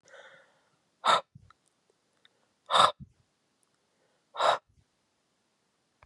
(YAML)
exhalation_length: 6.1 s
exhalation_amplitude: 16048
exhalation_signal_mean_std_ratio: 0.24
survey_phase: beta (2021-08-13 to 2022-03-07)
age: 45-64
gender: Male
wearing_mask: 'No'
symptom_cough_any: true
symptom_runny_or_blocked_nose: true
symptom_sore_throat: true
symptom_headache: true
symptom_change_to_sense_of_smell_or_taste: true
symptom_loss_of_taste: true
symptom_onset: 4 days
smoker_status: Never smoked
respiratory_condition_asthma: false
respiratory_condition_other: false
recruitment_source: Test and Trace
submission_delay: 2 days
covid_test_result: Positive
covid_test_method: RT-qPCR
covid_ct_value: 19.1
covid_ct_gene: ORF1ab gene